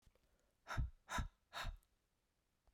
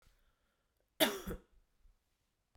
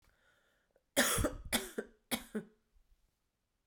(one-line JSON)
{"exhalation_length": "2.7 s", "exhalation_amplitude": 1169, "exhalation_signal_mean_std_ratio": 0.4, "cough_length": "2.6 s", "cough_amplitude": 5931, "cough_signal_mean_std_ratio": 0.23, "three_cough_length": "3.7 s", "three_cough_amplitude": 7520, "three_cough_signal_mean_std_ratio": 0.36, "survey_phase": "beta (2021-08-13 to 2022-03-07)", "age": "45-64", "gender": "Female", "wearing_mask": "No", "symptom_cough_any": true, "symptom_runny_or_blocked_nose": true, "symptom_change_to_sense_of_smell_or_taste": true, "symptom_loss_of_taste": true, "smoker_status": "Never smoked", "respiratory_condition_asthma": false, "respiratory_condition_other": false, "recruitment_source": "Test and Trace", "submission_delay": "2 days", "covid_test_result": "Positive", "covid_test_method": "RT-qPCR", "covid_ct_value": 24.4, "covid_ct_gene": "ORF1ab gene"}